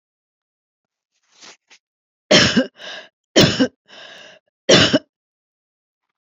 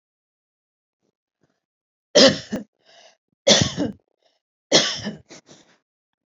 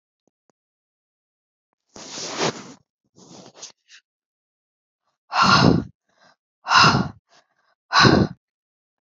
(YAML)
cough_length: 6.2 s
cough_amplitude: 31026
cough_signal_mean_std_ratio: 0.31
three_cough_length: 6.3 s
three_cough_amplitude: 32121
three_cough_signal_mean_std_ratio: 0.28
exhalation_length: 9.1 s
exhalation_amplitude: 28198
exhalation_signal_mean_std_ratio: 0.32
survey_phase: beta (2021-08-13 to 2022-03-07)
age: 65+
gender: Female
wearing_mask: 'No'
symptom_fatigue: true
smoker_status: Never smoked
respiratory_condition_asthma: false
respiratory_condition_other: true
recruitment_source: REACT
submission_delay: 1 day
covid_test_result: Negative
covid_test_method: RT-qPCR
influenza_a_test_result: Negative
influenza_b_test_result: Negative